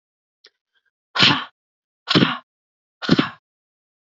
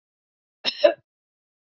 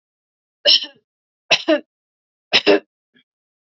{"exhalation_length": "4.2 s", "exhalation_amplitude": 32768, "exhalation_signal_mean_std_ratio": 0.3, "cough_length": "1.7 s", "cough_amplitude": 24308, "cough_signal_mean_std_ratio": 0.21, "three_cough_length": "3.7 s", "three_cough_amplitude": 32546, "three_cough_signal_mean_std_ratio": 0.3, "survey_phase": "beta (2021-08-13 to 2022-03-07)", "age": "45-64", "gender": "Female", "wearing_mask": "No", "symptom_cough_any": true, "symptom_runny_or_blocked_nose": true, "symptom_headache": true, "smoker_status": "Never smoked", "respiratory_condition_asthma": false, "respiratory_condition_other": false, "recruitment_source": "Test and Trace", "submission_delay": "2 days", "covid_test_result": "Positive", "covid_test_method": "RT-qPCR", "covid_ct_value": 25.5, "covid_ct_gene": "N gene", "covid_ct_mean": 25.7, "covid_viral_load": "3800 copies/ml", "covid_viral_load_category": "Minimal viral load (< 10K copies/ml)"}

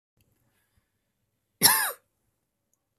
{"cough_length": "3.0 s", "cough_amplitude": 25122, "cough_signal_mean_std_ratio": 0.22, "survey_phase": "beta (2021-08-13 to 2022-03-07)", "age": "45-64", "gender": "Female", "wearing_mask": "No", "symptom_cough_any": true, "symptom_new_continuous_cough": true, "symptom_sore_throat": true, "smoker_status": "Ex-smoker", "respiratory_condition_asthma": false, "respiratory_condition_other": false, "recruitment_source": "Test and Trace", "submission_delay": "1 day", "covid_test_result": "Negative", "covid_test_method": "RT-qPCR"}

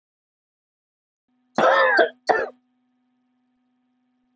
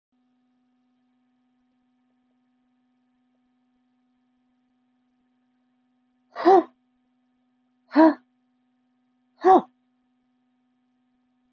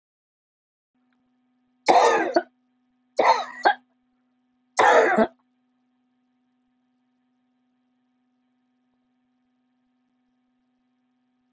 {"cough_length": "4.4 s", "cough_amplitude": 23673, "cough_signal_mean_std_ratio": 0.32, "exhalation_length": "11.5 s", "exhalation_amplitude": 19221, "exhalation_signal_mean_std_ratio": 0.18, "three_cough_length": "11.5 s", "three_cough_amplitude": 26482, "three_cough_signal_mean_std_ratio": 0.27, "survey_phase": "beta (2021-08-13 to 2022-03-07)", "age": "65+", "gender": "Female", "wearing_mask": "No", "symptom_cough_any": true, "symptom_shortness_of_breath": true, "smoker_status": "Current smoker (1 to 10 cigarettes per day)", "respiratory_condition_asthma": false, "respiratory_condition_other": false, "recruitment_source": "REACT", "submission_delay": "5 days", "covid_test_result": "Negative", "covid_test_method": "RT-qPCR", "influenza_a_test_result": "Negative", "influenza_b_test_result": "Negative"}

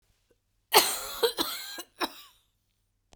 {"cough_length": "3.2 s", "cough_amplitude": 18997, "cough_signal_mean_std_ratio": 0.34, "survey_phase": "beta (2021-08-13 to 2022-03-07)", "age": "45-64", "gender": "Female", "wearing_mask": "No", "symptom_cough_any": true, "symptom_runny_or_blocked_nose": true, "symptom_sore_throat": true, "symptom_fatigue": true, "symptom_fever_high_temperature": true, "symptom_headache": true, "symptom_other": true, "smoker_status": "Never smoked", "respiratory_condition_asthma": false, "respiratory_condition_other": false, "recruitment_source": "Test and Trace", "submission_delay": "2 days", "covid_test_result": "Positive", "covid_test_method": "LFT"}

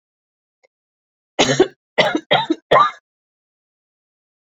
{"three_cough_length": "4.4 s", "three_cough_amplitude": 32327, "three_cough_signal_mean_std_ratio": 0.33, "survey_phase": "beta (2021-08-13 to 2022-03-07)", "age": "45-64", "gender": "Female", "wearing_mask": "No", "symptom_cough_any": true, "symptom_runny_or_blocked_nose": true, "symptom_onset": "6 days", "smoker_status": "Never smoked", "respiratory_condition_asthma": false, "respiratory_condition_other": false, "recruitment_source": "Test and Trace", "submission_delay": "1 day", "covid_test_result": "Positive", "covid_test_method": "RT-qPCR", "covid_ct_value": 15.9, "covid_ct_gene": "ORF1ab gene", "covid_ct_mean": 16.3, "covid_viral_load": "4700000 copies/ml", "covid_viral_load_category": "High viral load (>1M copies/ml)"}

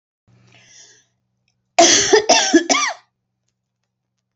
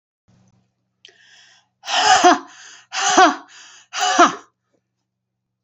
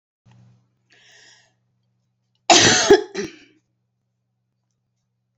{"three_cough_length": "4.4 s", "three_cough_amplitude": 29401, "three_cough_signal_mean_std_ratio": 0.38, "exhalation_length": "5.6 s", "exhalation_amplitude": 31901, "exhalation_signal_mean_std_ratio": 0.37, "cough_length": "5.4 s", "cough_amplitude": 32767, "cough_signal_mean_std_ratio": 0.25, "survey_phase": "beta (2021-08-13 to 2022-03-07)", "age": "45-64", "gender": "Female", "wearing_mask": "No", "symptom_none": true, "smoker_status": "Never smoked", "respiratory_condition_asthma": false, "respiratory_condition_other": false, "recruitment_source": "REACT", "submission_delay": "2 days", "covid_test_result": "Negative", "covid_test_method": "RT-qPCR"}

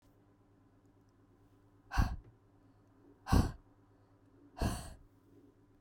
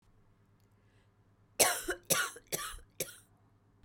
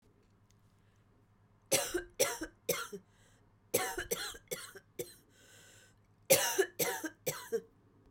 {"exhalation_length": "5.8 s", "exhalation_amplitude": 5766, "exhalation_signal_mean_std_ratio": 0.28, "cough_length": "3.8 s", "cough_amplitude": 9569, "cough_signal_mean_std_ratio": 0.33, "three_cough_length": "8.1 s", "three_cough_amplitude": 8758, "three_cough_signal_mean_std_ratio": 0.39, "survey_phase": "beta (2021-08-13 to 2022-03-07)", "age": "45-64", "gender": "Female", "wearing_mask": "No", "symptom_cough_any": true, "symptom_new_continuous_cough": true, "symptom_runny_or_blocked_nose": true, "symptom_shortness_of_breath": true, "symptom_diarrhoea": true, "symptom_fatigue": true, "symptom_change_to_sense_of_smell_or_taste": true, "symptom_loss_of_taste": true, "smoker_status": "Never smoked", "respiratory_condition_asthma": true, "respiratory_condition_other": false, "recruitment_source": "Test and Trace", "submission_delay": "4 days", "covid_test_method": "RT-qPCR", "covid_ct_value": 34.5, "covid_ct_gene": "ORF1ab gene"}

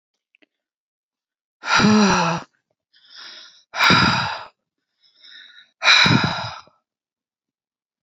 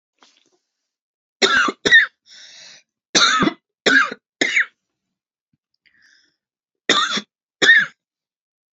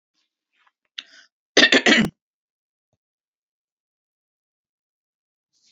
{"exhalation_length": "8.0 s", "exhalation_amplitude": 28241, "exhalation_signal_mean_std_ratio": 0.41, "three_cough_length": "8.8 s", "three_cough_amplitude": 30406, "three_cough_signal_mean_std_ratio": 0.37, "cough_length": "5.7 s", "cough_amplitude": 29197, "cough_signal_mean_std_ratio": 0.21, "survey_phase": "beta (2021-08-13 to 2022-03-07)", "age": "45-64", "gender": "Female", "wearing_mask": "No", "symptom_none": true, "smoker_status": "Ex-smoker", "respiratory_condition_asthma": false, "respiratory_condition_other": false, "recruitment_source": "REACT", "submission_delay": "0 days", "covid_test_result": "Negative", "covid_test_method": "RT-qPCR", "influenza_a_test_result": "Negative", "influenza_b_test_result": "Negative"}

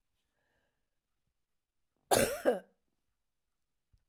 {"cough_length": "4.1 s", "cough_amplitude": 7988, "cough_signal_mean_std_ratio": 0.23, "survey_phase": "alpha (2021-03-01 to 2021-08-12)", "age": "65+", "gender": "Female", "wearing_mask": "No", "symptom_none": true, "smoker_status": "Never smoked", "respiratory_condition_asthma": false, "respiratory_condition_other": false, "recruitment_source": "REACT", "submission_delay": "1 day", "covid_test_result": "Negative", "covid_test_method": "RT-qPCR"}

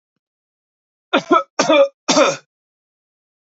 {"three_cough_length": "3.4 s", "three_cough_amplitude": 28006, "three_cough_signal_mean_std_ratio": 0.38, "survey_phase": "alpha (2021-03-01 to 2021-08-12)", "age": "18-44", "gender": "Male", "wearing_mask": "No", "symptom_none": true, "symptom_onset": "8 days", "smoker_status": "Never smoked", "respiratory_condition_asthma": false, "respiratory_condition_other": false, "recruitment_source": "REACT", "submission_delay": "1 day", "covid_test_result": "Negative", "covid_test_method": "RT-qPCR"}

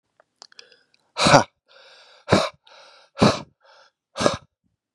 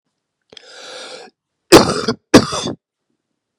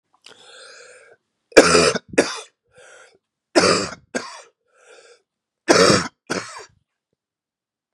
{"exhalation_length": "4.9 s", "exhalation_amplitude": 32767, "exhalation_signal_mean_std_ratio": 0.29, "cough_length": "3.6 s", "cough_amplitude": 32768, "cough_signal_mean_std_ratio": 0.29, "three_cough_length": "7.9 s", "three_cough_amplitude": 32768, "three_cough_signal_mean_std_ratio": 0.32, "survey_phase": "beta (2021-08-13 to 2022-03-07)", "age": "45-64", "gender": "Male", "wearing_mask": "No", "symptom_cough_any": true, "symptom_new_continuous_cough": true, "symptom_sore_throat": true, "symptom_fatigue": true, "symptom_headache": true, "symptom_other": true, "smoker_status": "Never smoked", "respiratory_condition_asthma": true, "respiratory_condition_other": false, "recruitment_source": "Test and Trace", "submission_delay": "0 days", "covid_test_result": "Positive", "covid_test_method": "LFT"}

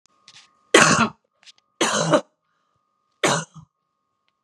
{"three_cough_length": "4.4 s", "three_cough_amplitude": 32767, "three_cough_signal_mean_std_ratio": 0.34, "survey_phase": "beta (2021-08-13 to 2022-03-07)", "age": "45-64", "gender": "Female", "wearing_mask": "No", "symptom_fatigue": true, "symptom_onset": "12 days", "smoker_status": "Never smoked", "respiratory_condition_asthma": false, "respiratory_condition_other": false, "recruitment_source": "REACT", "submission_delay": "1 day", "covid_test_result": "Negative", "covid_test_method": "RT-qPCR", "influenza_a_test_result": "Negative", "influenza_b_test_result": "Negative"}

